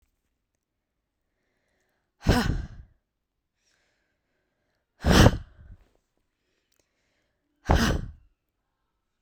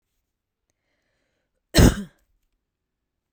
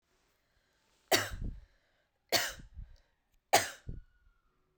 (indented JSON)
{
  "exhalation_length": "9.2 s",
  "exhalation_amplitude": 25421,
  "exhalation_signal_mean_std_ratio": 0.24,
  "cough_length": "3.3 s",
  "cough_amplitude": 30297,
  "cough_signal_mean_std_ratio": 0.19,
  "three_cough_length": "4.8 s",
  "three_cough_amplitude": 9624,
  "three_cough_signal_mean_std_ratio": 0.29,
  "survey_phase": "beta (2021-08-13 to 2022-03-07)",
  "age": "18-44",
  "gender": "Female",
  "wearing_mask": "No",
  "symptom_none": true,
  "smoker_status": "Ex-smoker",
  "respiratory_condition_asthma": false,
  "respiratory_condition_other": false,
  "recruitment_source": "REACT",
  "submission_delay": "1 day",
  "covid_test_result": "Negative",
  "covid_test_method": "RT-qPCR",
  "influenza_a_test_result": "Negative",
  "influenza_b_test_result": "Negative"
}